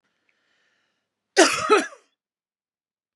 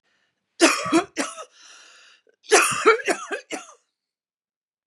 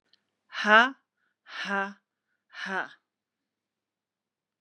{"cough_length": "3.2 s", "cough_amplitude": 30659, "cough_signal_mean_std_ratio": 0.27, "three_cough_length": "4.9 s", "three_cough_amplitude": 27313, "three_cough_signal_mean_std_ratio": 0.38, "exhalation_length": "4.6 s", "exhalation_amplitude": 22378, "exhalation_signal_mean_std_ratio": 0.25, "survey_phase": "beta (2021-08-13 to 2022-03-07)", "age": "45-64", "gender": "Female", "wearing_mask": "No", "symptom_cough_any": true, "symptom_runny_or_blocked_nose": true, "symptom_fatigue": true, "symptom_headache": true, "symptom_onset": "5 days", "smoker_status": "Never smoked", "respiratory_condition_asthma": false, "respiratory_condition_other": false, "recruitment_source": "Test and Trace", "submission_delay": "2 days", "covid_test_result": "Positive", "covid_test_method": "RT-qPCR", "covid_ct_value": 21.4, "covid_ct_gene": "ORF1ab gene", "covid_ct_mean": 21.7, "covid_viral_load": "75000 copies/ml", "covid_viral_load_category": "Low viral load (10K-1M copies/ml)"}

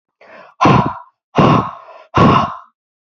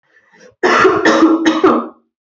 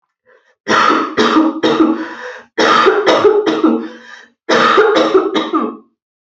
{"exhalation_length": "3.1 s", "exhalation_amplitude": 29298, "exhalation_signal_mean_std_ratio": 0.5, "cough_length": "2.4 s", "cough_amplitude": 29706, "cough_signal_mean_std_ratio": 0.65, "three_cough_length": "6.3 s", "three_cough_amplitude": 32767, "three_cough_signal_mean_std_ratio": 0.74, "survey_phase": "alpha (2021-03-01 to 2021-08-12)", "age": "18-44", "gender": "Female", "wearing_mask": "No", "symptom_cough_any": true, "symptom_shortness_of_breath": true, "symptom_abdominal_pain": true, "symptom_diarrhoea": true, "symptom_fatigue": true, "symptom_fever_high_temperature": true, "symptom_headache": true, "symptom_change_to_sense_of_smell_or_taste": true, "symptom_loss_of_taste": true, "symptom_onset": "3 days", "smoker_status": "Ex-smoker", "respiratory_condition_asthma": false, "respiratory_condition_other": false, "recruitment_source": "Test and Trace", "submission_delay": "2 days", "covid_test_result": "Positive", "covid_test_method": "RT-qPCR", "covid_ct_value": 25.5, "covid_ct_gene": "ORF1ab gene", "covid_ct_mean": 26.2, "covid_viral_load": "2600 copies/ml", "covid_viral_load_category": "Minimal viral load (< 10K copies/ml)"}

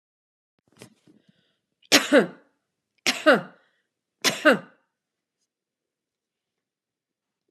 {"three_cough_length": "7.5 s", "three_cough_amplitude": 30679, "three_cough_signal_mean_std_ratio": 0.23, "survey_phase": "alpha (2021-03-01 to 2021-08-12)", "age": "65+", "gender": "Female", "wearing_mask": "No", "symptom_none": true, "smoker_status": "Ex-smoker", "respiratory_condition_asthma": false, "respiratory_condition_other": false, "recruitment_source": "REACT", "submission_delay": "2 days", "covid_test_result": "Negative", "covid_test_method": "RT-qPCR"}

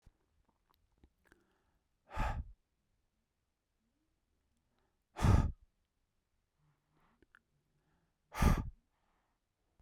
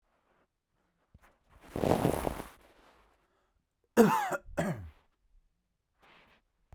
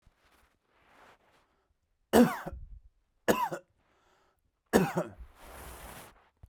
{"exhalation_length": "9.8 s", "exhalation_amplitude": 5173, "exhalation_signal_mean_std_ratio": 0.23, "cough_length": "6.7 s", "cough_amplitude": 12965, "cough_signal_mean_std_ratio": 0.29, "three_cough_length": "6.5 s", "three_cough_amplitude": 15594, "three_cough_signal_mean_std_ratio": 0.28, "survey_phase": "beta (2021-08-13 to 2022-03-07)", "age": "18-44", "gender": "Male", "wearing_mask": "No", "symptom_none": true, "smoker_status": "Never smoked", "respiratory_condition_asthma": false, "respiratory_condition_other": false, "recruitment_source": "REACT", "submission_delay": "2 days", "covid_test_result": "Negative", "covid_test_method": "RT-qPCR"}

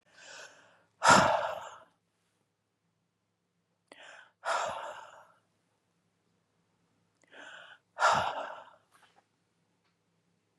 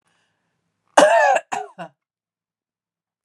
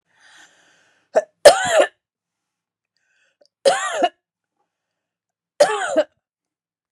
{"exhalation_length": "10.6 s", "exhalation_amplitude": 15412, "exhalation_signal_mean_std_ratio": 0.27, "cough_length": "3.2 s", "cough_amplitude": 32767, "cough_signal_mean_std_ratio": 0.32, "three_cough_length": "6.9 s", "three_cough_amplitude": 32768, "three_cough_signal_mean_std_ratio": 0.29, "survey_phase": "beta (2021-08-13 to 2022-03-07)", "age": "45-64", "gender": "Female", "wearing_mask": "No", "symptom_none": true, "smoker_status": "Never smoked", "respiratory_condition_asthma": false, "respiratory_condition_other": false, "recruitment_source": "REACT", "submission_delay": "1 day", "covid_test_result": "Negative", "covid_test_method": "RT-qPCR"}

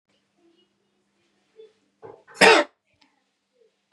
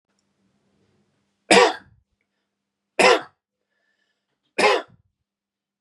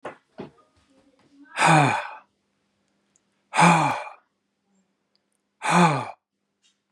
{"cough_length": "3.9 s", "cough_amplitude": 30049, "cough_signal_mean_std_ratio": 0.2, "three_cough_length": "5.8 s", "three_cough_amplitude": 31268, "three_cough_signal_mean_std_ratio": 0.26, "exhalation_length": "6.9 s", "exhalation_amplitude": 21273, "exhalation_signal_mean_std_ratio": 0.36, "survey_phase": "beta (2021-08-13 to 2022-03-07)", "age": "45-64", "gender": "Male", "wearing_mask": "No", "symptom_runny_or_blocked_nose": true, "symptom_other": true, "symptom_onset": "5 days", "smoker_status": "Never smoked", "respiratory_condition_asthma": false, "respiratory_condition_other": false, "recruitment_source": "Test and Trace", "submission_delay": "2 days", "covid_test_result": "Positive", "covid_test_method": "RT-qPCR"}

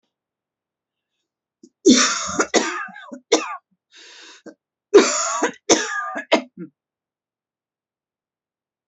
{"cough_length": "8.9 s", "cough_amplitude": 32767, "cough_signal_mean_std_ratio": 0.34, "survey_phase": "alpha (2021-03-01 to 2021-08-12)", "age": "18-44", "gender": "Female", "wearing_mask": "No", "symptom_cough_any": true, "symptom_shortness_of_breath": true, "symptom_fatigue": true, "symptom_change_to_sense_of_smell_or_taste": true, "symptom_loss_of_taste": true, "symptom_onset": "7 days", "smoker_status": "Ex-smoker", "respiratory_condition_asthma": false, "respiratory_condition_other": false, "recruitment_source": "Test and Trace", "submission_delay": "2 days", "covid_test_result": "Positive", "covid_test_method": "RT-qPCR", "covid_ct_value": 18.9, "covid_ct_gene": "ORF1ab gene", "covid_ct_mean": 19.3, "covid_viral_load": "470000 copies/ml", "covid_viral_load_category": "Low viral load (10K-1M copies/ml)"}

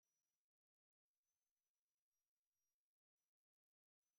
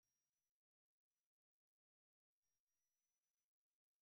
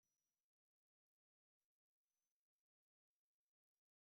{"three_cough_length": "4.2 s", "three_cough_amplitude": 2, "three_cough_signal_mean_std_ratio": 0.31, "cough_length": "4.0 s", "cough_amplitude": 3, "cough_signal_mean_std_ratio": 0.37, "exhalation_length": "4.0 s", "exhalation_amplitude": 3, "exhalation_signal_mean_std_ratio": 0.23, "survey_phase": "alpha (2021-03-01 to 2021-08-12)", "age": "65+", "gender": "Female", "wearing_mask": "No", "symptom_none": true, "smoker_status": "Never smoked", "respiratory_condition_asthma": false, "respiratory_condition_other": false, "recruitment_source": "REACT", "submission_delay": "2 days", "covid_test_result": "Negative", "covid_test_method": "RT-qPCR"}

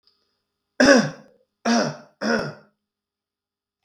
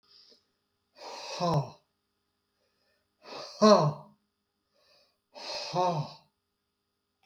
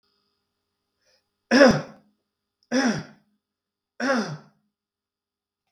{"cough_length": "3.8 s", "cough_amplitude": 31658, "cough_signal_mean_std_ratio": 0.36, "exhalation_length": "7.3 s", "exhalation_amplitude": 14948, "exhalation_signal_mean_std_ratio": 0.3, "three_cough_length": "5.7 s", "three_cough_amplitude": 23126, "three_cough_signal_mean_std_ratio": 0.29, "survey_phase": "beta (2021-08-13 to 2022-03-07)", "age": "65+", "gender": "Male", "wearing_mask": "No", "symptom_none": true, "smoker_status": "Never smoked", "respiratory_condition_asthma": false, "respiratory_condition_other": false, "recruitment_source": "REACT", "submission_delay": "25 days", "covid_test_result": "Negative", "covid_test_method": "RT-qPCR"}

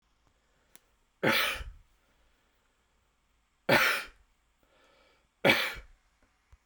{"three_cough_length": "6.7 s", "three_cough_amplitude": 12653, "three_cough_signal_mean_std_ratio": 0.3, "survey_phase": "beta (2021-08-13 to 2022-03-07)", "age": "18-44", "gender": "Male", "wearing_mask": "No", "symptom_none": true, "smoker_status": "Never smoked", "respiratory_condition_asthma": false, "respiratory_condition_other": false, "recruitment_source": "REACT", "submission_delay": "3 days", "covid_test_result": "Negative", "covid_test_method": "RT-qPCR"}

